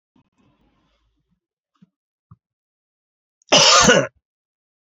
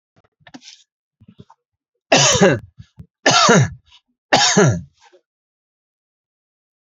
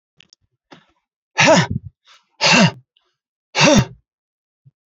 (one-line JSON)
{"cough_length": "4.9 s", "cough_amplitude": 29796, "cough_signal_mean_std_ratio": 0.27, "three_cough_length": "6.8 s", "three_cough_amplitude": 32247, "three_cough_signal_mean_std_ratio": 0.38, "exhalation_length": "4.9 s", "exhalation_amplitude": 29656, "exhalation_signal_mean_std_ratio": 0.36, "survey_phase": "beta (2021-08-13 to 2022-03-07)", "age": "45-64", "gender": "Male", "wearing_mask": "No", "symptom_none": true, "smoker_status": "Never smoked", "respiratory_condition_asthma": false, "respiratory_condition_other": false, "recruitment_source": "REACT", "submission_delay": "1 day", "covid_test_result": "Negative", "covid_test_method": "RT-qPCR", "influenza_a_test_result": "Negative", "influenza_b_test_result": "Negative"}